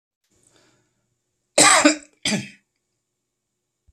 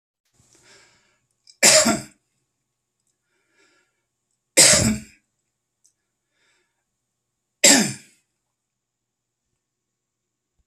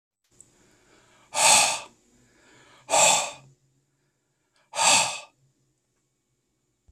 cough_length: 3.9 s
cough_amplitude: 32768
cough_signal_mean_std_ratio: 0.28
three_cough_length: 10.7 s
three_cough_amplitude: 32768
three_cough_signal_mean_std_ratio: 0.24
exhalation_length: 6.9 s
exhalation_amplitude: 20999
exhalation_signal_mean_std_ratio: 0.33
survey_phase: beta (2021-08-13 to 2022-03-07)
age: 45-64
gender: Male
wearing_mask: 'No'
symptom_none: true
smoker_status: Ex-smoker
respiratory_condition_asthma: false
respiratory_condition_other: false
recruitment_source: Test and Trace
submission_delay: 0 days
covid_test_result: Negative
covid_test_method: LFT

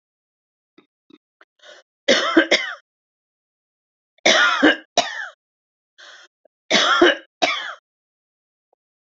three_cough_length: 9.0 s
three_cough_amplitude: 32767
three_cough_signal_mean_std_ratio: 0.35
survey_phase: beta (2021-08-13 to 2022-03-07)
age: 45-64
gender: Female
wearing_mask: 'No'
symptom_sore_throat: true
symptom_onset: 12 days
smoker_status: Ex-smoker
respiratory_condition_asthma: false
respiratory_condition_other: false
recruitment_source: REACT
submission_delay: 0 days
covid_test_result: Negative
covid_test_method: RT-qPCR
influenza_a_test_result: Negative
influenza_b_test_result: Negative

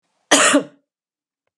cough_length: 1.6 s
cough_amplitude: 32529
cough_signal_mean_std_ratio: 0.36
survey_phase: beta (2021-08-13 to 2022-03-07)
age: 65+
gender: Female
wearing_mask: 'No'
symptom_none: true
smoker_status: Never smoked
respiratory_condition_asthma: false
respiratory_condition_other: false
recruitment_source: REACT
submission_delay: 2 days
covid_test_result: Negative
covid_test_method: RT-qPCR
influenza_a_test_result: Negative
influenza_b_test_result: Negative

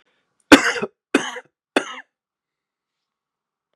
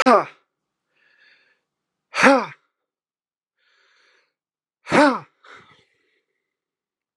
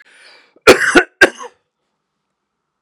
three_cough_length: 3.8 s
three_cough_amplitude: 32768
three_cough_signal_mean_std_ratio: 0.22
exhalation_length: 7.2 s
exhalation_amplitude: 32087
exhalation_signal_mean_std_ratio: 0.24
cough_length: 2.8 s
cough_amplitude: 32768
cough_signal_mean_std_ratio: 0.29
survey_phase: beta (2021-08-13 to 2022-03-07)
age: 45-64
gender: Male
wearing_mask: 'No'
symptom_none: true
smoker_status: Ex-smoker
respiratory_condition_asthma: false
respiratory_condition_other: false
recruitment_source: REACT
submission_delay: 3 days
covid_test_result: Negative
covid_test_method: RT-qPCR
influenza_a_test_result: Negative
influenza_b_test_result: Negative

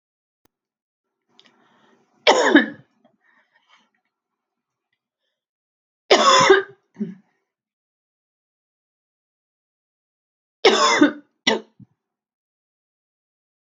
three_cough_length: 13.7 s
three_cough_amplitude: 30168
three_cough_signal_mean_std_ratio: 0.26
survey_phase: beta (2021-08-13 to 2022-03-07)
age: 45-64
gender: Female
wearing_mask: 'No'
symptom_cough_any: true
symptom_runny_or_blocked_nose: true
symptom_fatigue: true
symptom_change_to_sense_of_smell_or_taste: true
symptom_loss_of_taste: true
symptom_onset: 5 days
smoker_status: Never smoked
respiratory_condition_asthma: false
respiratory_condition_other: false
recruitment_source: Test and Trace
submission_delay: 2 days
covid_test_result: Positive
covid_test_method: RT-qPCR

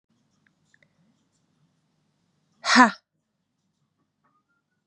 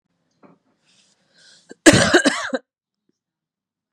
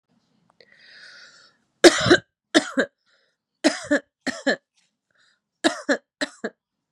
exhalation_length: 4.9 s
exhalation_amplitude: 30325
exhalation_signal_mean_std_ratio: 0.17
cough_length: 3.9 s
cough_amplitude: 32768
cough_signal_mean_std_ratio: 0.27
three_cough_length: 6.9 s
three_cough_amplitude: 32767
three_cough_signal_mean_std_ratio: 0.28
survey_phase: beta (2021-08-13 to 2022-03-07)
age: 18-44
gender: Female
wearing_mask: 'No'
symptom_cough_any: true
symptom_runny_or_blocked_nose: true
symptom_sore_throat: true
symptom_fatigue: true
symptom_fever_high_temperature: true
symptom_headache: true
symptom_loss_of_taste: true
symptom_onset: 4 days
smoker_status: Never smoked
respiratory_condition_asthma: false
respiratory_condition_other: false
recruitment_source: Test and Trace
submission_delay: 3 days
covid_test_result: Positive
covid_test_method: ePCR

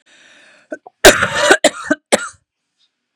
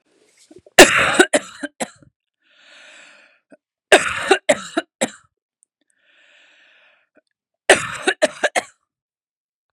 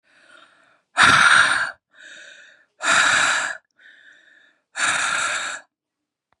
cough_length: 3.2 s
cough_amplitude: 32768
cough_signal_mean_std_ratio: 0.35
three_cough_length: 9.7 s
three_cough_amplitude: 32768
three_cough_signal_mean_std_ratio: 0.27
exhalation_length: 6.4 s
exhalation_amplitude: 30685
exhalation_signal_mean_std_ratio: 0.47
survey_phase: beta (2021-08-13 to 2022-03-07)
age: 18-44
gender: Female
wearing_mask: 'No'
symptom_cough_any: true
smoker_status: Never smoked
respiratory_condition_asthma: false
respiratory_condition_other: false
recruitment_source: REACT
submission_delay: 1 day
covid_test_result: Negative
covid_test_method: RT-qPCR
influenza_a_test_result: Negative
influenza_b_test_result: Negative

